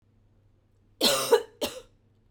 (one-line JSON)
{"cough_length": "2.3 s", "cough_amplitude": 12741, "cough_signal_mean_std_ratio": 0.35, "survey_phase": "beta (2021-08-13 to 2022-03-07)", "age": "45-64", "gender": "Female", "wearing_mask": "No", "symptom_none": true, "smoker_status": "Ex-smoker", "respiratory_condition_asthma": false, "respiratory_condition_other": false, "recruitment_source": "REACT", "submission_delay": "1 day", "covid_test_result": "Negative", "covid_test_method": "RT-qPCR"}